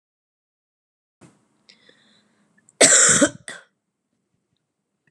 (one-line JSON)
{"cough_length": "5.1 s", "cough_amplitude": 32437, "cough_signal_mean_std_ratio": 0.25, "survey_phase": "beta (2021-08-13 to 2022-03-07)", "age": "18-44", "gender": "Female", "wearing_mask": "No", "symptom_cough_any": true, "symptom_sore_throat": true, "symptom_onset": "13 days", "smoker_status": "Current smoker (e-cigarettes or vapes only)", "respiratory_condition_asthma": true, "respiratory_condition_other": false, "recruitment_source": "REACT", "submission_delay": "2 days", "covid_test_result": "Negative", "covid_test_method": "RT-qPCR"}